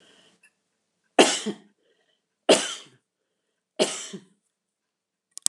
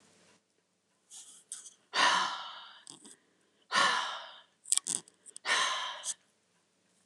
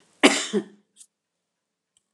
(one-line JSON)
{"three_cough_length": "5.5 s", "three_cough_amplitude": 29204, "three_cough_signal_mean_std_ratio": 0.24, "exhalation_length": "7.1 s", "exhalation_amplitude": 16821, "exhalation_signal_mean_std_ratio": 0.39, "cough_length": "2.1 s", "cough_amplitude": 27086, "cough_signal_mean_std_ratio": 0.26, "survey_phase": "beta (2021-08-13 to 2022-03-07)", "age": "65+", "gender": "Female", "wearing_mask": "No", "symptom_none": true, "smoker_status": "Ex-smoker", "respiratory_condition_asthma": false, "respiratory_condition_other": false, "recruitment_source": "REACT", "submission_delay": "3 days", "covid_test_result": "Negative", "covid_test_method": "RT-qPCR", "influenza_a_test_result": "Negative", "influenza_b_test_result": "Negative"}